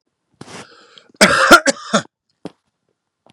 {"cough_length": "3.3 s", "cough_amplitude": 32768, "cough_signal_mean_std_ratio": 0.31, "survey_phase": "beta (2021-08-13 to 2022-03-07)", "age": "45-64", "gender": "Male", "wearing_mask": "No", "symptom_none": true, "smoker_status": "Never smoked", "respiratory_condition_asthma": false, "respiratory_condition_other": false, "recruitment_source": "REACT", "submission_delay": "2 days", "covid_test_result": "Negative", "covid_test_method": "RT-qPCR", "influenza_a_test_result": "Negative", "influenza_b_test_result": "Negative"}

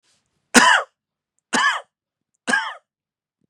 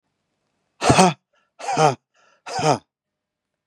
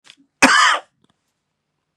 {"three_cough_length": "3.5 s", "three_cough_amplitude": 32768, "three_cough_signal_mean_std_ratio": 0.34, "exhalation_length": "3.7 s", "exhalation_amplitude": 32762, "exhalation_signal_mean_std_ratio": 0.35, "cough_length": "2.0 s", "cough_amplitude": 32768, "cough_signal_mean_std_ratio": 0.35, "survey_phase": "beta (2021-08-13 to 2022-03-07)", "age": "45-64", "gender": "Male", "wearing_mask": "No", "symptom_none": true, "smoker_status": "Ex-smoker", "respiratory_condition_asthma": false, "respiratory_condition_other": false, "recruitment_source": "REACT", "submission_delay": "1 day", "covid_test_result": "Negative", "covid_test_method": "RT-qPCR"}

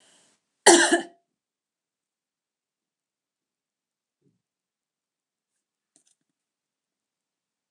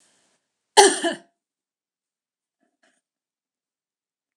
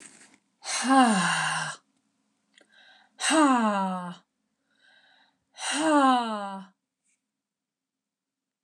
{"cough_length": "7.7 s", "cough_amplitude": 27915, "cough_signal_mean_std_ratio": 0.15, "three_cough_length": "4.4 s", "three_cough_amplitude": 29204, "three_cough_signal_mean_std_ratio": 0.18, "exhalation_length": "8.6 s", "exhalation_amplitude": 14858, "exhalation_signal_mean_std_ratio": 0.46, "survey_phase": "alpha (2021-03-01 to 2021-08-12)", "age": "45-64", "gender": "Female", "wearing_mask": "No", "symptom_none": true, "smoker_status": "Never smoked", "respiratory_condition_asthma": false, "respiratory_condition_other": false, "recruitment_source": "REACT", "submission_delay": "3 days", "covid_test_result": "Negative", "covid_test_method": "RT-qPCR"}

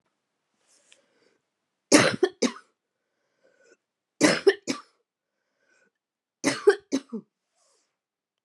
{"three_cough_length": "8.4 s", "three_cough_amplitude": 22994, "three_cough_signal_mean_std_ratio": 0.25, "survey_phase": "beta (2021-08-13 to 2022-03-07)", "age": "18-44", "gender": "Female", "wearing_mask": "No", "symptom_cough_any": true, "symptom_new_continuous_cough": true, "symptom_runny_or_blocked_nose": true, "symptom_fever_high_temperature": true, "smoker_status": "Current smoker (1 to 10 cigarettes per day)", "respiratory_condition_asthma": false, "respiratory_condition_other": false, "recruitment_source": "Test and Trace", "submission_delay": "1 day", "covid_test_result": "Positive", "covid_test_method": "RT-qPCR", "covid_ct_value": 14.8, "covid_ct_gene": "ORF1ab gene", "covid_ct_mean": 15.3, "covid_viral_load": "9600000 copies/ml", "covid_viral_load_category": "High viral load (>1M copies/ml)"}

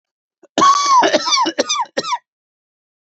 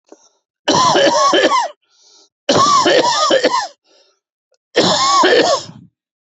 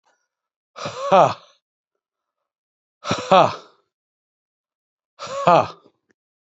{"cough_length": "3.1 s", "cough_amplitude": 28635, "cough_signal_mean_std_ratio": 0.56, "three_cough_length": "6.4 s", "three_cough_amplitude": 29292, "three_cough_signal_mean_std_ratio": 0.65, "exhalation_length": "6.6 s", "exhalation_amplitude": 30046, "exhalation_signal_mean_std_ratio": 0.28, "survey_phase": "beta (2021-08-13 to 2022-03-07)", "age": "65+", "gender": "Male", "wearing_mask": "No", "symptom_runny_or_blocked_nose": true, "smoker_status": "Ex-smoker", "respiratory_condition_asthma": false, "respiratory_condition_other": false, "recruitment_source": "REACT", "submission_delay": "4 days", "covid_test_result": "Negative", "covid_test_method": "RT-qPCR", "influenza_a_test_result": "Negative", "influenza_b_test_result": "Negative"}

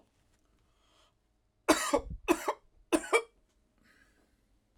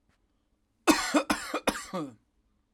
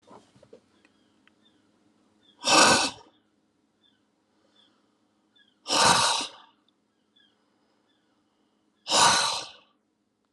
{"three_cough_length": "4.8 s", "three_cough_amplitude": 10217, "three_cough_signal_mean_std_ratio": 0.29, "cough_length": "2.7 s", "cough_amplitude": 13746, "cough_signal_mean_std_ratio": 0.39, "exhalation_length": "10.3 s", "exhalation_amplitude": 20059, "exhalation_signal_mean_std_ratio": 0.31, "survey_phase": "alpha (2021-03-01 to 2021-08-12)", "age": "45-64", "gender": "Male", "wearing_mask": "No", "symptom_none": true, "smoker_status": "Never smoked", "respiratory_condition_asthma": false, "respiratory_condition_other": false, "recruitment_source": "REACT", "submission_delay": "3 days", "covid_test_result": "Negative", "covid_test_method": "RT-qPCR"}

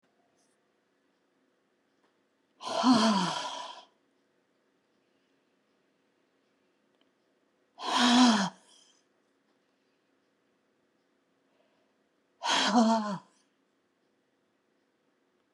{"exhalation_length": "15.5 s", "exhalation_amplitude": 11108, "exhalation_signal_mean_std_ratio": 0.3, "survey_phase": "beta (2021-08-13 to 2022-03-07)", "age": "65+", "gender": "Female", "wearing_mask": "No", "symptom_none": true, "smoker_status": "Ex-smoker", "respiratory_condition_asthma": false, "respiratory_condition_other": false, "recruitment_source": "REACT", "submission_delay": "3 days", "covid_test_result": "Negative", "covid_test_method": "RT-qPCR"}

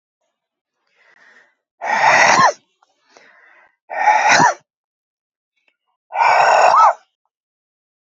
{"exhalation_length": "8.1 s", "exhalation_amplitude": 32768, "exhalation_signal_mean_std_ratio": 0.43, "survey_phase": "beta (2021-08-13 to 2022-03-07)", "age": "65+", "gender": "Female", "wearing_mask": "No", "symptom_runny_or_blocked_nose": true, "symptom_fatigue": true, "symptom_headache": true, "symptom_onset": "6 days", "smoker_status": "Current smoker (e-cigarettes or vapes only)", "respiratory_condition_asthma": false, "respiratory_condition_other": false, "recruitment_source": "Test and Trace", "submission_delay": "2 days", "covid_test_result": "Positive", "covid_test_method": "RT-qPCR", "covid_ct_value": 21.3, "covid_ct_gene": "ORF1ab gene", "covid_ct_mean": 21.9, "covid_viral_load": "64000 copies/ml", "covid_viral_load_category": "Low viral load (10K-1M copies/ml)"}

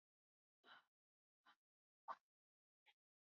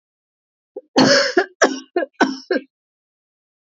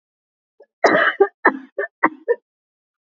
{"exhalation_length": "3.2 s", "exhalation_amplitude": 306, "exhalation_signal_mean_std_ratio": 0.17, "three_cough_length": "3.8 s", "three_cough_amplitude": 29117, "three_cough_signal_mean_std_ratio": 0.38, "cough_length": "3.2 s", "cough_amplitude": 27949, "cough_signal_mean_std_ratio": 0.35, "survey_phase": "beta (2021-08-13 to 2022-03-07)", "age": "18-44", "gender": "Female", "wearing_mask": "No", "symptom_none": true, "smoker_status": "Never smoked", "respiratory_condition_asthma": false, "respiratory_condition_other": false, "recruitment_source": "REACT", "submission_delay": "2 days", "covid_test_result": "Negative", "covid_test_method": "RT-qPCR", "influenza_a_test_result": "Unknown/Void", "influenza_b_test_result": "Unknown/Void"}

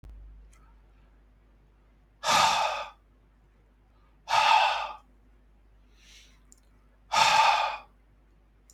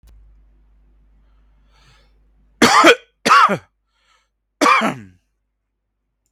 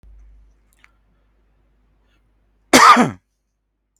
{"exhalation_length": "8.7 s", "exhalation_amplitude": 12438, "exhalation_signal_mean_std_ratio": 0.39, "three_cough_length": "6.3 s", "three_cough_amplitude": 32767, "three_cough_signal_mean_std_ratio": 0.32, "cough_length": "4.0 s", "cough_amplitude": 32768, "cough_signal_mean_std_ratio": 0.25, "survey_phase": "beta (2021-08-13 to 2022-03-07)", "age": "18-44", "gender": "Male", "wearing_mask": "No", "symptom_none": true, "symptom_onset": "13 days", "smoker_status": "Never smoked", "respiratory_condition_asthma": false, "respiratory_condition_other": false, "recruitment_source": "REACT", "submission_delay": "2 days", "covid_test_result": "Negative", "covid_test_method": "RT-qPCR", "influenza_a_test_result": "Negative", "influenza_b_test_result": "Negative"}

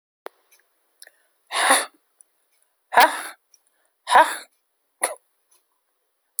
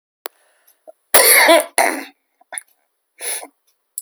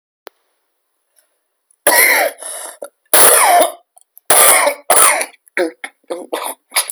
{"exhalation_length": "6.4 s", "exhalation_amplitude": 28431, "exhalation_signal_mean_std_ratio": 0.26, "cough_length": "4.0 s", "cough_amplitude": 32768, "cough_signal_mean_std_ratio": 0.36, "three_cough_length": "6.9 s", "three_cough_amplitude": 32768, "three_cough_signal_mean_std_ratio": 0.48, "survey_phase": "beta (2021-08-13 to 2022-03-07)", "age": "45-64", "gender": "Female", "wearing_mask": "No", "symptom_cough_any": true, "symptom_shortness_of_breath": true, "symptom_onset": "12 days", "smoker_status": "Current smoker (11 or more cigarettes per day)", "respiratory_condition_asthma": false, "respiratory_condition_other": true, "recruitment_source": "REACT", "submission_delay": "1 day", "covid_test_result": "Negative", "covid_test_method": "RT-qPCR", "influenza_a_test_result": "Negative", "influenza_b_test_result": "Negative"}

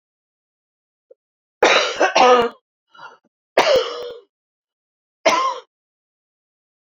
{"three_cough_length": "6.8 s", "three_cough_amplitude": 27808, "three_cough_signal_mean_std_ratio": 0.37, "survey_phase": "beta (2021-08-13 to 2022-03-07)", "age": "65+", "gender": "Female", "wearing_mask": "No", "symptom_cough_any": true, "symptom_runny_or_blocked_nose": true, "symptom_sore_throat": true, "symptom_fatigue": true, "symptom_change_to_sense_of_smell_or_taste": true, "symptom_onset": "3 days", "smoker_status": "Never smoked", "respiratory_condition_asthma": false, "respiratory_condition_other": true, "recruitment_source": "Test and Trace", "submission_delay": "1 day", "covid_test_result": "Positive", "covid_test_method": "RT-qPCR", "covid_ct_value": 18.2, "covid_ct_gene": "N gene"}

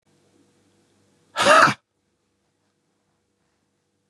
{"exhalation_length": "4.1 s", "exhalation_amplitude": 29815, "exhalation_signal_mean_std_ratio": 0.23, "survey_phase": "beta (2021-08-13 to 2022-03-07)", "age": "45-64", "gender": "Male", "wearing_mask": "No", "symptom_cough_any": true, "symptom_runny_or_blocked_nose": true, "symptom_shortness_of_breath": true, "symptom_sore_throat": true, "symptom_abdominal_pain": true, "symptom_diarrhoea": true, "symptom_fatigue": true, "symptom_headache": true, "symptom_loss_of_taste": true, "symptom_other": true, "smoker_status": "Ex-smoker", "respiratory_condition_asthma": true, "respiratory_condition_other": false, "recruitment_source": "Test and Trace", "submission_delay": "3 days", "covid_test_result": "Positive", "covid_test_method": "LFT"}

